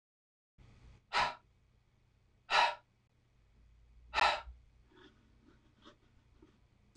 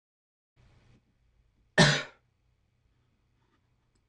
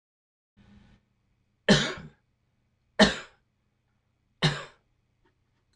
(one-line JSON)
{"exhalation_length": "7.0 s", "exhalation_amplitude": 5562, "exhalation_signal_mean_std_ratio": 0.27, "cough_length": "4.1 s", "cough_amplitude": 13518, "cough_signal_mean_std_ratio": 0.19, "three_cough_length": "5.8 s", "three_cough_amplitude": 19347, "three_cough_signal_mean_std_ratio": 0.23, "survey_phase": "beta (2021-08-13 to 2022-03-07)", "age": "65+", "gender": "Male", "wearing_mask": "No", "symptom_cough_any": true, "symptom_sore_throat": true, "symptom_onset": "8 days", "smoker_status": "Ex-smoker", "respiratory_condition_asthma": false, "respiratory_condition_other": false, "recruitment_source": "REACT", "submission_delay": "1 day", "covid_test_result": "Negative", "covid_test_method": "RT-qPCR"}